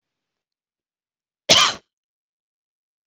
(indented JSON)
{
  "cough_length": "3.1 s",
  "cough_amplitude": 25863,
  "cough_signal_mean_std_ratio": 0.2,
  "survey_phase": "beta (2021-08-13 to 2022-03-07)",
  "age": "18-44",
  "gender": "Female",
  "wearing_mask": "No",
  "symptom_none": true,
  "smoker_status": "Never smoked",
  "respiratory_condition_asthma": true,
  "respiratory_condition_other": false,
  "recruitment_source": "REACT",
  "submission_delay": "2 days",
  "covid_test_result": "Negative",
  "covid_test_method": "RT-qPCR",
  "influenza_a_test_result": "Unknown/Void",
  "influenza_b_test_result": "Unknown/Void"
}